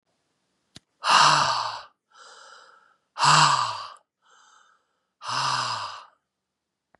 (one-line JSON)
{"exhalation_length": "7.0 s", "exhalation_amplitude": 21192, "exhalation_signal_mean_std_ratio": 0.4, "survey_phase": "beta (2021-08-13 to 2022-03-07)", "age": "45-64", "gender": "Female", "wearing_mask": "No", "symptom_cough_any": true, "symptom_new_continuous_cough": true, "symptom_shortness_of_breath": true, "symptom_fatigue": true, "symptom_headache": true, "symptom_onset": "5 days", "smoker_status": "Prefer not to say", "respiratory_condition_asthma": false, "respiratory_condition_other": false, "recruitment_source": "Test and Trace", "submission_delay": "1 day", "covid_test_result": "Negative", "covid_test_method": "RT-qPCR"}